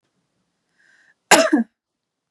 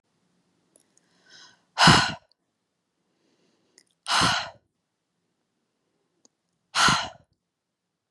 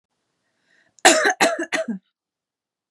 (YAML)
cough_length: 2.3 s
cough_amplitude: 32768
cough_signal_mean_std_ratio: 0.27
exhalation_length: 8.1 s
exhalation_amplitude: 23247
exhalation_signal_mean_std_ratio: 0.26
three_cough_length: 2.9 s
three_cough_amplitude: 32768
three_cough_signal_mean_std_ratio: 0.35
survey_phase: beta (2021-08-13 to 2022-03-07)
age: 18-44
gender: Female
wearing_mask: 'No'
symptom_none: true
smoker_status: Never smoked
respiratory_condition_asthma: true
respiratory_condition_other: false
recruitment_source: REACT
submission_delay: 0 days
covid_test_result: Negative
covid_test_method: RT-qPCR
influenza_a_test_result: Negative
influenza_b_test_result: Negative